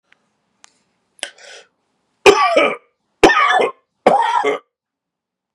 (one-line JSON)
{"three_cough_length": "5.5 s", "three_cough_amplitude": 32768, "three_cough_signal_mean_std_ratio": 0.4, "survey_phase": "beta (2021-08-13 to 2022-03-07)", "age": "45-64", "gender": "Male", "wearing_mask": "No", "symptom_cough_any": true, "symptom_runny_or_blocked_nose": true, "symptom_sore_throat": true, "symptom_onset": "3 days", "smoker_status": "Never smoked", "respiratory_condition_asthma": true, "respiratory_condition_other": false, "recruitment_source": "Test and Trace", "submission_delay": "2 days", "covid_test_result": "Positive", "covid_test_method": "ePCR"}